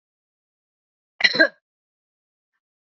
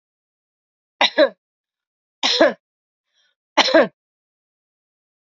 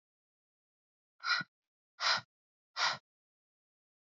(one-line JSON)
{"cough_length": "2.8 s", "cough_amplitude": 30519, "cough_signal_mean_std_ratio": 0.19, "three_cough_length": "5.3 s", "three_cough_amplitude": 29240, "three_cough_signal_mean_std_ratio": 0.28, "exhalation_length": "4.1 s", "exhalation_amplitude": 4467, "exhalation_signal_mean_std_ratio": 0.29, "survey_phase": "beta (2021-08-13 to 2022-03-07)", "age": "45-64", "gender": "Female", "wearing_mask": "No", "symptom_none": true, "smoker_status": "Current smoker (11 or more cigarettes per day)", "respiratory_condition_asthma": true, "respiratory_condition_other": false, "recruitment_source": "REACT", "submission_delay": "2 days", "covid_test_result": "Negative", "covid_test_method": "RT-qPCR", "influenza_a_test_result": "Negative", "influenza_b_test_result": "Negative"}